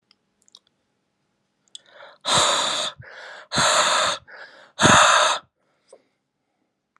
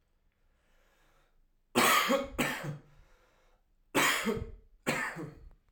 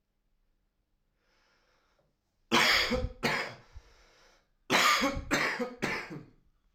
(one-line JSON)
{"exhalation_length": "7.0 s", "exhalation_amplitude": 28523, "exhalation_signal_mean_std_ratio": 0.43, "three_cough_length": "5.7 s", "three_cough_amplitude": 7552, "three_cough_signal_mean_std_ratio": 0.44, "cough_length": "6.7 s", "cough_amplitude": 8325, "cough_signal_mean_std_ratio": 0.45, "survey_phase": "alpha (2021-03-01 to 2021-08-12)", "age": "18-44", "gender": "Male", "wearing_mask": "No", "symptom_cough_any": true, "symptom_diarrhoea": true, "symptom_fatigue": true, "symptom_fever_high_temperature": true, "symptom_headache": true, "smoker_status": "Current smoker (11 or more cigarettes per day)", "respiratory_condition_asthma": false, "respiratory_condition_other": false, "recruitment_source": "Test and Trace", "submission_delay": "2 days", "covid_test_result": "Positive", "covid_test_method": "RT-qPCR"}